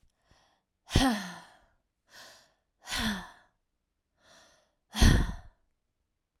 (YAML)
exhalation_length: 6.4 s
exhalation_amplitude: 14902
exhalation_signal_mean_std_ratio: 0.29
survey_phase: alpha (2021-03-01 to 2021-08-12)
age: 18-44
gender: Female
wearing_mask: 'No'
symptom_none: true
smoker_status: Ex-smoker
respiratory_condition_asthma: false
respiratory_condition_other: false
recruitment_source: REACT
submission_delay: 1 day
covid_test_result: Negative
covid_test_method: RT-qPCR